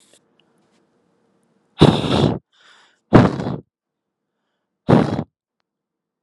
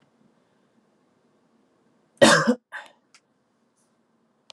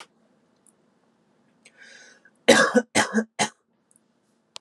{
  "exhalation_length": "6.2 s",
  "exhalation_amplitude": 32768,
  "exhalation_signal_mean_std_ratio": 0.3,
  "cough_length": "4.5 s",
  "cough_amplitude": 26769,
  "cough_signal_mean_std_ratio": 0.21,
  "three_cough_length": "4.6 s",
  "three_cough_amplitude": 30399,
  "three_cough_signal_mean_std_ratio": 0.28,
  "survey_phase": "alpha (2021-03-01 to 2021-08-12)",
  "age": "18-44",
  "gender": "Male",
  "wearing_mask": "No",
  "symptom_cough_any": true,
  "smoker_status": "Never smoked",
  "respiratory_condition_asthma": false,
  "respiratory_condition_other": false,
  "recruitment_source": "Test and Trace",
  "submission_delay": "2 days",
  "covid_test_result": "Positive",
  "covid_test_method": "RT-qPCR"
}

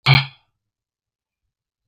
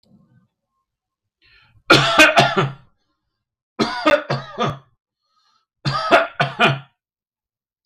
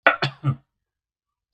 {
  "exhalation_length": "1.9 s",
  "exhalation_amplitude": 31346,
  "exhalation_signal_mean_std_ratio": 0.23,
  "three_cough_length": "7.9 s",
  "three_cough_amplitude": 32768,
  "three_cough_signal_mean_std_ratio": 0.39,
  "cough_length": "1.5 s",
  "cough_amplitude": 32768,
  "cough_signal_mean_std_ratio": 0.3,
  "survey_phase": "beta (2021-08-13 to 2022-03-07)",
  "age": "18-44",
  "gender": "Male",
  "wearing_mask": "No",
  "symptom_none": true,
  "smoker_status": "Never smoked",
  "respiratory_condition_asthma": false,
  "respiratory_condition_other": false,
  "recruitment_source": "REACT",
  "submission_delay": "3 days",
  "covid_test_result": "Negative",
  "covid_test_method": "RT-qPCR",
  "influenza_a_test_result": "Negative",
  "influenza_b_test_result": "Negative"
}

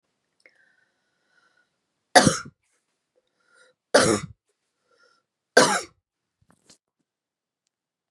{
  "three_cough_length": "8.1 s",
  "three_cough_amplitude": 32668,
  "three_cough_signal_mean_std_ratio": 0.21,
  "survey_phase": "beta (2021-08-13 to 2022-03-07)",
  "age": "45-64",
  "gender": "Female",
  "wearing_mask": "No",
  "symptom_runny_or_blocked_nose": true,
  "symptom_sore_throat": true,
  "symptom_onset": "4 days",
  "smoker_status": "Never smoked",
  "respiratory_condition_asthma": false,
  "respiratory_condition_other": false,
  "recruitment_source": "Test and Trace",
  "submission_delay": "1 day",
  "covid_test_result": "Positive",
  "covid_test_method": "ePCR"
}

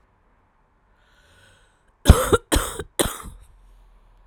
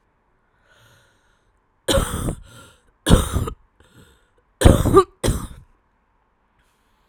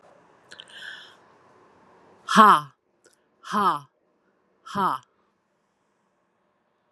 {
  "cough_length": "4.3 s",
  "cough_amplitude": 32768,
  "cough_signal_mean_std_ratio": 0.25,
  "three_cough_length": "7.1 s",
  "three_cough_amplitude": 32768,
  "three_cough_signal_mean_std_ratio": 0.31,
  "exhalation_length": "6.9 s",
  "exhalation_amplitude": 30345,
  "exhalation_signal_mean_std_ratio": 0.25,
  "survey_phase": "alpha (2021-03-01 to 2021-08-12)",
  "age": "45-64",
  "gender": "Female",
  "wearing_mask": "No",
  "symptom_cough_any": true,
  "symptom_fatigue": true,
  "symptom_headache": true,
  "symptom_change_to_sense_of_smell_or_taste": true,
  "symptom_loss_of_taste": true,
  "smoker_status": "Never smoked",
  "respiratory_condition_asthma": true,
  "respiratory_condition_other": false,
  "recruitment_source": "Test and Trace",
  "submission_delay": "2 days",
  "covid_test_result": "Positive",
  "covid_test_method": "RT-qPCR",
  "covid_ct_value": 17.6,
  "covid_ct_gene": "ORF1ab gene"
}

